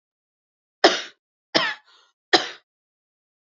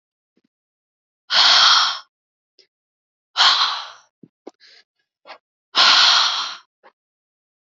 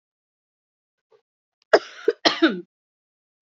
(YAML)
three_cough_length: 3.5 s
three_cough_amplitude: 29902
three_cough_signal_mean_std_ratio: 0.25
exhalation_length: 7.7 s
exhalation_amplitude: 31357
exhalation_signal_mean_std_ratio: 0.39
cough_length: 3.4 s
cough_amplitude: 29274
cough_signal_mean_std_ratio: 0.23
survey_phase: beta (2021-08-13 to 2022-03-07)
age: 18-44
gender: Female
wearing_mask: 'No'
symptom_cough_any: true
symptom_runny_or_blocked_nose: true
symptom_shortness_of_breath: true
symptom_sore_throat: true
symptom_fatigue: true
symptom_headache: true
symptom_other: true
symptom_onset: 4 days
smoker_status: Never smoked
respiratory_condition_asthma: true
respiratory_condition_other: false
recruitment_source: Test and Trace
submission_delay: 2 days
covid_test_result: Positive
covid_test_method: RT-qPCR
covid_ct_value: 35.1
covid_ct_gene: N gene